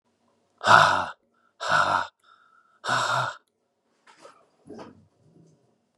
{
  "exhalation_length": "6.0 s",
  "exhalation_amplitude": 31378,
  "exhalation_signal_mean_std_ratio": 0.35,
  "survey_phase": "beta (2021-08-13 to 2022-03-07)",
  "age": "45-64",
  "gender": "Male",
  "wearing_mask": "No",
  "symptom_cough_any": true,
  "symptom_runny_or_blocked_nose": true,
  "symptom_onset": "2 days",
  "smoker_status": "Ex-smoker",
  "respiratory_condition_asthma": false,
  "respiratory_condition_other": false,
  "recruitment_source": "Test and Trace",
  "submission_delay": "2 days",
  "covid_test_result": "Positive",
  "covid_test_method": "RT-qPCR",
  "covid_ct_value": 26.5,
  "covid_ct_gene": "ORF1ab gene",
  "covid_ct_mean": 26.8,
  "covid_viral_load": "1600 copies/ml",
  "covid_viral_load_category": "Minimal viral load (< 10K copies/ml)"
}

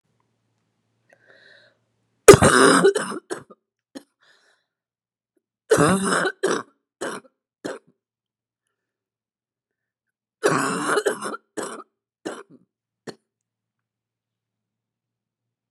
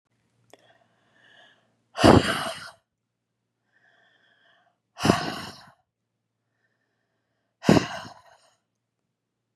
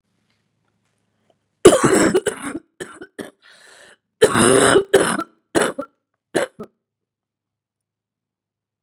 {
  "three_cough_length": "15.7 s",
  "three_cough_amplitude": 32768,
  "three_cough_signal_mean_std_ratio": 0.26,
  "exhalation_length": "9.6 s",
  "exhalation_amplitude": 29515,
  "exhalation_signal_mean_std_ratio": 0.22,
  "cough_length": "8.8 s",
  "cough_amplitude": 32768,
  "cough_signal_mean_std_ratio": 0.34,
  "survey_phase": "beta (2021-08-13 to 2022-03-07)",
  "age": "45-64",
  "gender": "Female",
  "wearing_mask": "No",
  "symptom_cough_any": true,
  "symptom_runny_or_blocked_nose": true,
  "symptom_sore_throat": true,
  "symptom_fatigue": true,
  "smoker_status": "Never smoked",
  "respiratory_condition_asthma": false,
  "respiratory_condition_other": false,
  "recruitment_source": "Test and Trace",
  "submission_delay": "0 days",
  "covid_test_result": "Positive",
  "covid_test_method": "LFT"
}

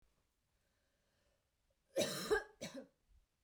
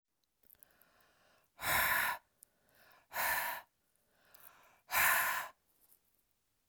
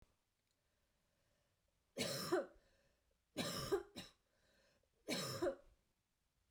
{
  "cough_length": "3.4 s",
  "cough_amplitude": 2250,
  "cough_signal_mean_std_ratio": 0.31,
  "exhalation_length": "6.7 s",
  "exhalation_amplitude": 4240,
  "exhalation_signal_mean_std_ratio": 0.4,
  "three_cough_length": "6.5 s",
  "three_cough_amplitude": 1365,
  "three_cough_signal_mean_std_ratio": 0.38,
  "survey_phase": "beta (2021-08-13 to 2022-03-07)",
  "age": "45-64",
  "gender": "Female",
  "wearing_mask": "No",
  "symptom_none": true,
  "smoker_status": "Never smoked",
  "respiratory_condition_asthma": false,
  "respiratory_condition_other": false,
  "recruitment_source": "REACT",
  "submission_delay": "1 day",
  "covid_test_result": "Negative",
  "covid_test_method": "RT-qPCR"
}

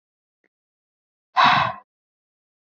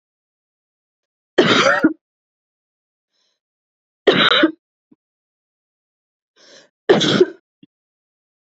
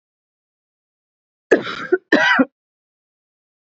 {
  "exhalation_length": "2.6 s",
  "exhalation_amplitude": 21326,
  "exhalation_signal_mean_std_ratio": 0.29,
  "three_cough_length": "8.4 s",
  "three_cough_amplitude": 27811,
  "three_cough_signal_mean_std_ratio": 0.31,
  "cough_length": "3.8 s",
  "cough_amplitude": 27621,
  "cough_signal_mean_std_ratio": 0.3,
  "survey_phase": "beta (2021-08-13 to 2022-03-07)",
  "age": "18-44",
  "gender": "Female",
  "wearing_mask": "No",
  "symptom_none": true,
  "symptom_onset": "10 days",
  "smoker_status": "Never smoked",
  "respiratory_condition_asthma": false,
  "respiratory_condition_other": false,
  "recruitment_source": "REACT",
  "submission_delay": "-1 day",
  "covid_test_result": "Negative",
  "covid_test_method": "RT-qPCR",
  "influenza_a_test_result": "Negative",
  "influenza_b_test_result": "Negative"
}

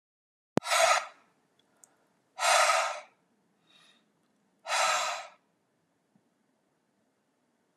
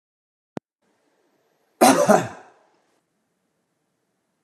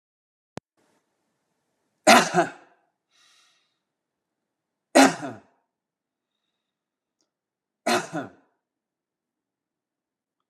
{
  "exhalation_length": "7.8 s",
  "exhalation_amplitude": 15789,
  "exhalation_signal_mean_std_ratio": 0.35,
  "cough_length": "4.4 s",
  "cough_amplitude": 29422,
  "cough_signal_mean_std_ratio": 0.24,
  "three_cough_length": "10.5 s",
  "three_cough_amplitude": 29991,
  "three_cough_signal_mean_std_ratio": 0.2,
  "survey_phase": "beta (2021-08-13 to 2022-03-07)",
  "age": "45-64",
  "gender": "Male",
  "wearing_mask": "No",
  "symptom_none": true,
  "smoker_status": "Never smoked",
  "respiratory_condition_asthma": false,
  "respiratory_condition_other": false,
  "recruitment_source": "REACT",
  "submission_delay": "1 day",
  "covid_test_result": "Negative",
  "covid_test_method": "RT-qPCR"
}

